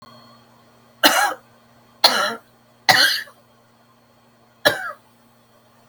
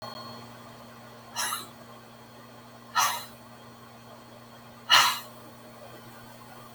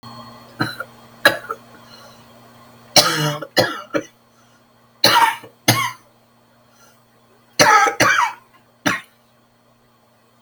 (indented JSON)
{
  "three_cough_length": "5.9 s",
  "three_cough_amplitude": 32768,
  "three_cough_signal_mean_std_ratio": 0.34,
  "exhalation_length": "6.7 s",
  "exhalation_amplitude": 17845,
  "exhalation_signal_mean_std_ratio": 0.38,
  "cough_length": "10.4 s",
  "cough_amplitude": 32768,
  "cough_signal_mean_std_ratio": 0.38,
  "survey_phase": "beta (2021-08-13 to 2022-03-07)",
  "age": "65+",
  "gender": "Female",
  "wearing_mask": "No",
  "symptom_cough_any": true,
  "symptom_runny_or_blocked_nose": true,
  "symptom_fatigue": true,
  "symptom_onset": "8 days",
  "smoker_status": "Never smoked",
  "respiratory_condition_asthma": true,
  "respiratory_condition_other": false,
  "recruitment_source": "REACT",
  "submission_delay": "1 day",
  "covid_test_result": "Positive",
  "covid_test_method": "RT-qPCR",
  "covid_ct_value": 26.4,
  "covid_ct_gene": "E gene",
  "influenza_a_test_result": "Negative",
  "influenza_b_test_result": "Negative"
}